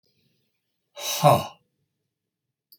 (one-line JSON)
{"cough_length": "2.8 s", "cough_amplitude": 21712, "cough_signal_mean_std_ratio": 0.26, "survey_phase": "beta (2021-08-13 to 2022-03-07)", "age": "45-64", "gender": "Male", "wearing_mask": "No", "symptom_none": true, "smoker_status": "Never smoked", "respiratory_condition_asthma": false, "respiratory_condition_other": false, "recruitment_source": "REACT", "submission_delay": "2 days", "covid_test_result": "Negative", "covid_test_method": "RT-qPCR", "influenza_a_test_result": "Unknown/Void", "influenza_b_test_result": "Unknown/Void"}